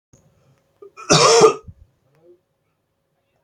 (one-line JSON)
{"cough_length": "3.4 s", "cough_amplitude": 32767, "cough_signal_mean_std_ratio": 0.31, "survey_phase": "beta (2021-08-13 to 2022-03-07)", "age": "45-64", "gender": "Male", "wearing_mask": "No", "symptom_none": true, "symptom_onset": "13 days", "smoker_status": "Never smoked", "respiratory_condition_asthma": false, "respiratory_condition_other": false, "recruitment_source": "REACT", "submission_delay": "2 days", "covid_test_result": "Negative", "covid_test_method": "RT-qPCR", "influenza_a_test_result": "Negative", "influenza_b_test_result": "Negative"}